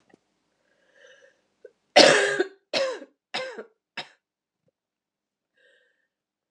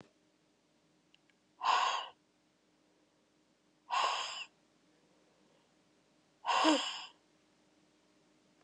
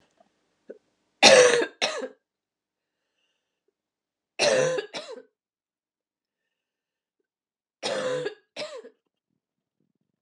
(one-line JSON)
{"cough_length": "6.5 s", "cough_amplitude": 29644, "cough_signal_mean_std_ratio": 0.25, "exhalation_length": "8.6 s", "exhalation_amplitude": 5384, "exhalation_signal_mean_std_ratio": 0.33, "three_cough_length": "10.2 s", "three_cough_amplitude": 30534, "three_cough_signal_mean_std_ratio": 0.28, "survey_phase": "alpha (2021-03-01 to 2021-08-12)", "age": "45-64", "gender": "Female", "wearing_mask": "No", "symptom_cough_any": true, "symptom_new_continuous_cough": true, "symptom_shortness_of_breath": true, "symptom_abdominal_pain": true, "symptom_fatigue": true, "symptom_headache": true, "symptom_change_to_sense_of_smell_or_taste": true, "smoker_status": "Never smoked", "respiratory_condition_asthma": false, "respiratory_condition_other": false, "recruitment_source": "Test and Trace", "submission_delay": "2 days", "covid_test_result": "Positive", "covid_test_method": "RT-qPCR", "covid_ct_value": 27.1, "covid_ct_gene": "ORF1ab gene", "covid_ct_mean": 27.8, "covid_viral_load": "750 copies/ml", "covid_viral_load_category": "Minimal viral load (< 10K copies/ml)"}